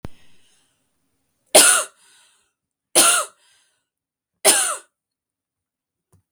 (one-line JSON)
{"three_cough_length": "6.3 s", "three_cough_amplitude": 32646, "three_cough_signal_mean_std_ratio": 0.29, "survey_phase": "beta (2021-08-13 to 2022-03-07)", "age": "18-44", "gender": "Female", "wearing_mask": "No", "symptom_sore_throat": true, "symptom_onset": "1 day", "smoker_status": "Ex-smoker", "respiratory_condition_asthma": false, "respiratory_condition_other": false, "recruitment_source": "Test and Trace", "submission_delay": "1 day", "covid_test_result": "Negative", "covid_test_method": "RT-qPCR"}